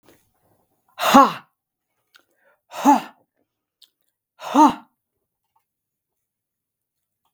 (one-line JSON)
{"exhalation_length": "7.3 s", "exhalation_amplitude": 32766, "exhalation_signal_mean_std_ratio": 0.24, "survey_phase": "beta (2021-08-13 to 2022-03-07)", "age": "65+", "gender": "Male", "wearing_mask": "No", "symptom_none": true, "smoker_status": "Never smoked", "respiratory_condition_asthma": false, "respiratory_condition_other": false, "recruitment_source": "REACT", "submission_delay": "2 days", "covid_test_result": "Negative", "covid_test_method": "RT-qPCR", "influenza_a_test_result": "Negative", "influenza_b_test_result": "Negative"}